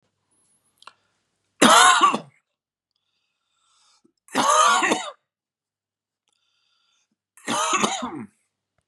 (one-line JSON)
{"three_cough_length": "8.9 s", "three_cough_amplitude": 31642, "three_cough_signal_mean_std_ratio": 0.35, "survey_phase": "beta (2021-08-13 to 2022-03-07)", "age": "45-64", "gender": "Male", "wearing_mask": "No", "symptom_none": true, "smoker_status": "Ex-smoker", "respiratory_condition_asthma": false, "respiratory_condition_other": false, "recruitment_source": "REACT", "submission_delay": "2 days", "covid_test_result": "Negative", "covid_test_method": "RT-qPCR", "influenza_a_test_result": "Negative", "influenza_b_test_result": "Negative"}